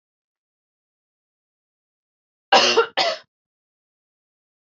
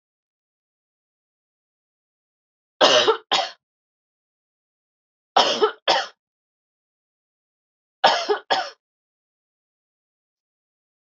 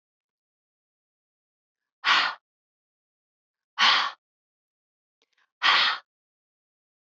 cough_length: 4.6 s
cough_amplitude: 27208
cough_signal_mean_std_ratio: 0.25
three_cough_length: 11.0 s
three_cough_amplitude: 27948
three_cough_signal_mean_std_ratio: 0.27
exhalation_length: 7.1 s
exhalation_amplitude: 15406
exhalation_signal_mean_std_ratio: 0.28
survey_phase: alpha (2021-03-01 to 2021-08-12)
age: 18-44
gender: Female
wearing_mask: 'No'
symptom_none: true
smoker_status: Never smoked
respiratory_condition_asthma: false
respiratory_condition_other: false
recruitment_source: REACT
submission_delay: 2 days
covid_test_result: Negative
covid_test_method: RT-qPCR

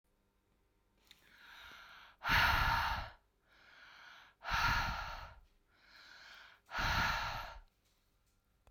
exhalation_length: 8.7 s
exhalation_amplitude: 3879
exhalation_signal_mean_std_ratio: 0.45
survey_phase: beta (2021-08-13 to 2022-03-07)
age: 45-64
gender: Female
wearing_mask: 'No'
symptom_none: true
smoker_status: Never smoked
respiratory_condition_asthma: false
respiratory_condition_other: false
recruitment_source: Test and Trace
submission_delay: 1 day
covid_test_result: Negative
covid_test_method: RT-qPCR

